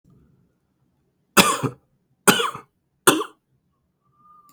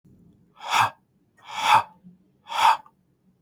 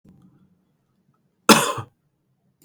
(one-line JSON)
{"three_cough_length": "4.5 s", "three_cough_amplitude": 32768, "three_cough_signal_mean_std_ratio": 0.27, "exhalation_length": "3.4 s", "exhalation_amplitude": 18399, "exhalation_signal_mean_std_ratio": 0.37, "cough_length": "2.6 s", "cough_amplitude": 32768, "cough_signal_mean_std_ratio": 0.21, "survey_phase": "beta (2021-08-13 to 2022-03-07)", "age": "18-44", "gender": "Male", "wearing_mask": "No", "symptom_cough_any": true, "symptom_runny_or_blocked_nose": true, "symptom_onset": "12 days", "smoker_status": "Never smoked", "respiratory_condition_asthma": false, "respiratory_condition_other": false, "recruitment_source": "REACT", "submission_delay": "3 days", "covid_test_result": "Negative", "covid_test_method": "RT-qPCR", "influenza_a_test_result": "Negative", "influenza_b_test_result": "Negative"}